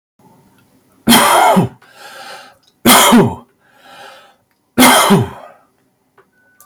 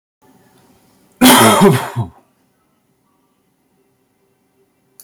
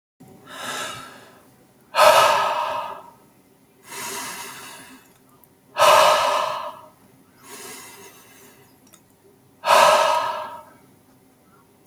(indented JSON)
{
  "three_cough_length": "6.7 s",
  "three_cough_amplitude": 32768,
  "three_cough_signal_mean_std_ratio": 0.45,
  "cough_length": "5.0 s",
  "cough_amplitude": 32768,
  "cough_signal_mean_std_ratio": 0.32,
  "exhalation_length": "11.9 s",
  "exhalation_amplitude": 28201,
  "exhalation_signal_mean_std_ratio": 0.41,
  "survey_phase": "beta (2021-08-13 to 2022-03-07)",
  "age": "45-64",
  "gender": "Male",
  "wearing_mask": "No",
  "symptom_none": true,
  "smoker_status": "Current smoker (11 or more cigarettes per day)",
  "respiratory_condition_asthma": false,
  "respiratory_condition_other": false,
  "recruitment_source": "REACT",
  "submission_delay": "2 days",
  "covid_test_result": "Negative",
  "covid_test_method": "RT-qPCR",
  "influenza_a_test_result": "Unknown/Void",
  "influenza_b_test_result": "Unknown/Void"
}